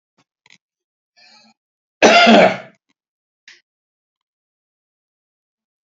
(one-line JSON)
{"cough_length": "5.9 s", "cough_amplitude": 31509, "cough_signal_mean_std_ratio": 0.25, "survey_phase": "alpha (2021-03-01 to 2021-08-12)", "age": "65+", "gender": "Male", "wearing_mask": "No", "symptom_none": true, "smoker_status": "Never smoked", "respiratory_condition_asthma": false, "respiratory_condition_other": false, "recruitment_source": "REACT", "submission_delay": "1 day", "covid_test_result": "Negative", "covid_test_method": "RT-qPCR"}